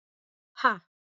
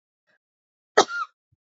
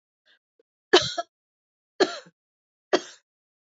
{"exhalation_length": "1.0 s", "exhalation_amplitude": 13363, "exhalation_signal_mean_std_ratio": 0.24, "cough_length": "1.8 s", "cough_amplitude": 25190, "cough_signal_mean_std_ratio": 0.21, "three_cough_length": "3.8 s", "three_cough_amplitude": 23248, "three_cough_signal_mean_std_ratio": 0.22, "survey_phase": "alpha (2021-03-01 to 2021-08-12)", "age": "45-64", "gender": "Female", "wearing_mask": "No", "symptom_fatigue": true, "symptom_headache": true, "symptom_onset": "6 days", "smoker_status": "Ex-smoker", "respiratory_condition_asthma": false, "respiratory_condition_other": false, "recruitment_source": "Test and Trace", "submission_delay": "2 days", "covid_test_result": "Positive", "covid_test_method": "RT-qPCR", "covid_ct_value": 19.2, "covid_ct_gene": "N gene", "covid_ct_mean": 19.4, "covid_viral_load": "420000 copies/ml", "covid_viral_load_category": "Low viral load (10K-1M copies/ml)"}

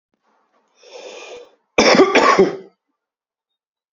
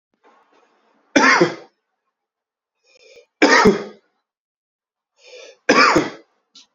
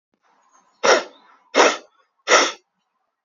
{"cough_length": "3.9 s", "cough_amplitude": 30537, "cough_signal_mean_std_ratio": 0.36, "three_cough_length": "6.7 s", "three_cough_amplitude": 32768, "three_cough_signal_mean_std_ratio": 0.34, "exhalation_length": "3.2 s", "exhalation_amplitude": 29104, "exhalation_signal_mean_std_ratio": 0.34, "survey_phase": "beta (2021-08-13 to 2022-03-07)", "age": "18-44", "gender": "Male", "wearing_mask": "No", "symptom_cough_any": true, "symptom_fatigue": true, "symptom_change_to_sense_of_smell_or_taste": true, "symptom_loss_of_taste": true, "smoker_status": "Never smoked", "respiratory_condition_asthma": true, "respiratory_condition_other": false, "recruitment_source": "Test and Trace", "submission_delay": "3 days", "covid_test_result": "Positive", "covid_test_method": "RT-qPCR", "covid_ct_value": 17.4, "covid_ct_gene": "ORF1ab gene", "covid_ct_mean": 17.5, "covid_viral_load": "1800000 copies/ml", "covid_viral_load_category": "High viral load (>1M copies/ml)"}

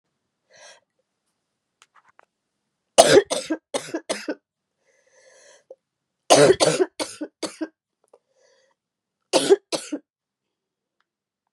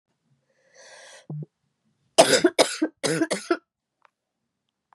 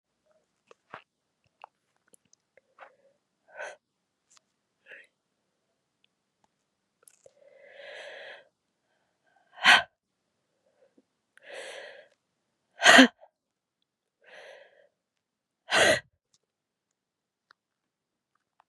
{"three_cough_length": "11.5 s", "three_cough_amplitude": 32768, "three_cough_signal_mean_std_ratio": 0.26, "cough_length": "4.9 s", "cough_amplitude": 31914, "cough_signal_mean_std_ratio": 0.31, "exhalation_length": "18.7 s", "exhalation_amplitude": 28464, "exhalation_signal_mean_std_ratio": 0.16, "survey_phase": "beta (2021-08-13 to 2022-03-07)", "age": "45-64", "gender": "Female", "wearing_mask": "No", "symptom_cough_any": true, "symptom_runny_or_blocked_nose": true, "symptom_sore_throat": true, "symptom_fatigue": true, "symptom_headache": true, "symptom_change_to_sense_of_smell_or_taste": true, "symptom_loss_of_taste": true, "symptom_onset": "3 days", "smoker_status": "Never smoked", "respiratory_condition_asthma": false, "respiratory_condition_other": false, "recruitment_source": "Test and Trace", "submission_delay": "2 days", "covid_test_result": "Positive", "covid_test_method": "RT-qPCR", "covid_ct_value": 17.1, "covid_ct_gene": "ORF1ab gene"}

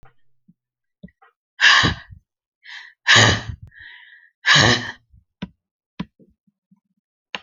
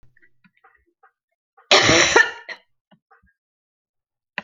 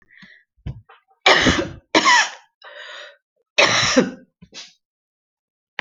{"exhalation_length": "7.4 s", "exhalation_amplitude": 32768, "exhalation_signal_mean_std_ratio": 0.32, "cough_length": "4.4 s", "cough_amplitude": 32767, "cough_signal_mean_std_ratio": 0.29, "three_cough_length": "5.8 s", "three_cough_amplitude": 31842, "three_cough_signal_mean_std_ratio": 0.39, "survey_phase": "alpha (2021-03-01 to 2021-08-12)", "age": "45-64", "gender": "Female", "wearing_mask": "No", "symptom_fatigue": true, "symptom_onset": "6 days", "smoker_status": "Ex-smoker", "respiratory_condition_asthma": true, "respiratory_condition_other": false, "recruitment_source": "REACT", "submission_delay": "1 day", "covid_test_result": "Negative", "covid_test_method": "RT-qPCR"}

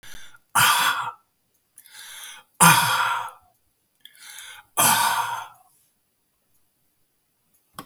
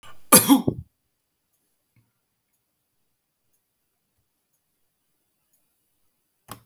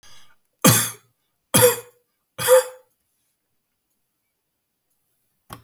{"exhalation_length": "7.9 s", "exhalation_amplitude": 32085, "exhalation_signal_mean_std_ratio": 0.39, "cough_length": "6.7 s", "cough_amplitude": 32768, "cough_signal_mean_std_ratio": 0.17, "three_cough_length": "5.6 s", "three_cough_amplitude": 32519, "three_cough_signal_mean_std_ratio": 0.28, "survey_phase": "beta (2021-08-13 to 2022-03-07)", "age": "65+", "gender": "Male", "wearing_mask": "No", "symptom_none": true, "smoker_status": "Ex-smoker", "respiratory_condition_asthma": false, "respiratory_condition_other": false, "recruitment_source": "REACT", "submission_delay": "3 days", "covid_test_result": "Negative", "covid_test_method": "RT-qPCR", "influenza_a_test_result": "Negative", "influenza_b_test_result": "Negative"}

